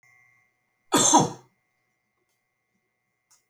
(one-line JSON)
{"cough_length": "3.5 s", "cough_amplitude": 21119, "cough_signal_mean_std_ratio": 0.26, "survey_phase": "alpha (2021-03-01 to 2021-08-12)", "age": "65+", "gender": "Male", "wearing_mask": "No", "symptom_none": true, "smoker_status": "Never smoked", "respiratory_condition_asthma": false, "respiratory_condition_other": false, "recruitment_source": "REACT", "submission_delay": "1 day", "covid_test_result": "Negative", "covid_test_method": "RT-qPCR"}